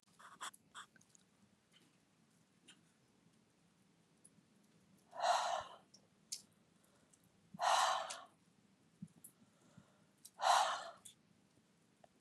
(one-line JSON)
{"exhalation_length": "12.2 s", "exhalation_amplitude": 3053, "exhalation_signal_mean_std_ratio": 0.31, "survey_phase": "beta (2021-08-13 to 2022-03-07)", "age": "45-64", "gender": "Female", "wearing_mask": "No", "symptom_none": true, "smoker_status": "Never smoked", "respiratory_condition_asthma": false, "respiratory_condition_other": false, "recruitment_source": "REACT", "submission_delay": "1 day", "covid_test_result": "Negative", "covid_test_method": "RT-qPCR", "influenza_a_test_result": "Negative", "influenza_b_test_result": "Negative"}